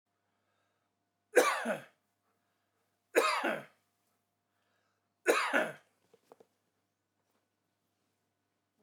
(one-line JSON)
{"three_cough_length": "8.8 s", "three_cough_amplitude": 8882, "three_cough_signal_mean_std_ratio": 0.28, "survey_phase": "alpha (2021-03-01 to 2021-08-12)", "age": "65+", "gender": "Male", "wearing_mask": "No", "symptom_none": true, "smoker_status": "Never smoked", "respiratory_condition_asthma": false, "respiratory_condition_other": false, "recruitment_source": "REACT", "submission_delay": "2 days", "covid_test_result": "Negative", "covid_test_method": "RT-qPCR"}